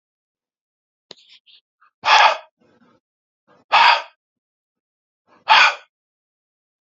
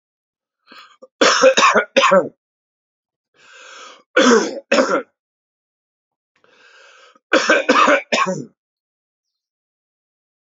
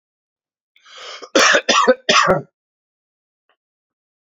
{"exhalation_length": "6.9 s", "exhalation_amplitude": 32767, "exhalation_signal_mean_std_ratio": 0.28, "three_cough_length": "10.6 s", "three_cough_amplitude": 32120, "three_cough_signal_mean_std_ratio": 0.39, "cough_length": "4.4 s", "cough_amplitude": 32768, "cough_signal_mean_std_ratio": 0.36, "survey_phase": "beta (2021-08-13 to 2022-03-07)", "age": "18-44", "gender": "Male", "wearing_mask": "No", "symptom_runny_or_blocked_nose": true, "symptom_fatigue": true, "smoker_status": "Never smoked", "respiratory_condition_asthma": false, "respiratory_condition_other": false, "recruitment_source": "Test and Trace", "submission_delay": "1 day", "covid_test_result": "Positive", "covid_test_method": "RT-qPCR", "covid_ct_value": 18.8, "covid_ct_gene": "ORF1ab gene", "covid_ct_mean": 19.4, "covid_viral_load": "440000 copies/ml", "covid_viral_load_category": "Low viral load (10K-1M copies/ml)"}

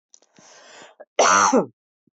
{"cough_length": "2.1 s", "cough_amplitude": 17264, "cough_signal_mean_std_ratio": 0.41, "survey_phase": "beta (2021-08-13 to 2022-03-07)", "age": "45-64", "gender": "Female", "wearing_mask": "No", "symptom_none": true, "symptom_onset": "13 days", "smoker_status": "Never smoked", "respiratory_condition_asthma": false, "respiratory_condition_other": false, "recruitment_source": "REACT", "submission_delay": "1 day", "covid_test_result": "Negative", "covid_test_method": "RT-qPCR"}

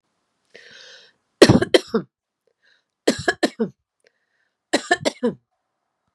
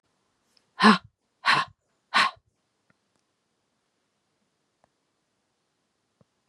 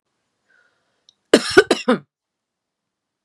{"three_cough_length": "6.1 s", "three_cough_amplitude": 32768, "three_cough_signal_mean_std_ratio": 0.26, "exhalation_length": "6.5 s", "exhalation_amplitude": 23805, "exhalation_signal_mean_std_ratio": 0.21, "cough_length": "3.2 s", "cough_amplitude": 32768, "cough_signal_mean_std_ratio": 0.23, "survey_phase": "beta (2021-08-13 to 2022-03-07)", "age": "45-64", "gender": "Female", "wearing_mask": "No", "symptom_runny_or_blocked_nose": true, "symptom_headache": true, "smoker_status": "Ex-smoker", "respiratory_condition_asthma": false, "respiratory_condition_other": false, "recruitment_source": "Test and Trace", "submission_delay": "2 days", "covid_test_result": "Positive", "covid_test_method": "ePCR"}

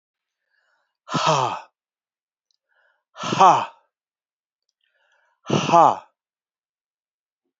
{"exhalation_length": "7.6 s", "exhalation_amplitude": 27768, "exhalation_signal_mean_std_ratio": 0.28, "survey_phase": "beta (2021-08-13 to 2022-03-07)", "age": "65+", "gender": "Male", "wearing_mask": "No", "symptom_cough_any": true, "symptom_runny_or_blocked_nose": true, "symptom_change_to_sense_of_smell_or_taste": true, "symptom_onset": "3 days", "smoker_status": "Ex-smoker", "respiratory_condition_asthma": false, "respiratory_condition_other": false, "recruitment_source": "Test and Trace", "submission_delay": "2 days", "covid_test_result": "Positive", "covid_test_method": "RT-qPCR"}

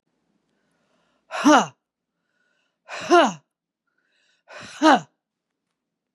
{"exhalation_length": "6.1 s", "exhalation_amplitude": 25962, "exhalation_signal_mean_std_ratio": 0.26, "survey_phase": "beta (2021-08-13 to 2022-03-07)", "age": "45-64", "gender": "Female", "wearing_mask": "No", "symptom_cough_any": true, "symptom_runny_or_blocked_nose": true, "symptom_shortness_of_breath": true, "symptom_sore_throat": true, "symptom_fatigue": true, "symptom_headache": true, "symptom_onset": "2 days", "smoker_status": "Never smoked", "respiratory_condition_asthma": false, "respiratory_condition_other": false, "recruitment_source": "Test and Trace", "submission_delay": "2 days", "covid_test_result": "Positive", "covid_test_method": "RT-qPCR", "covid_ct_value": 25.0, "covid_ct_gene": "N gene", "covid_ct_mean": 25.1, "covid_viral_load": "5800 copies/ml", "covid_viral_load_category": "Minimal viral load (< 10K copies/ml)"}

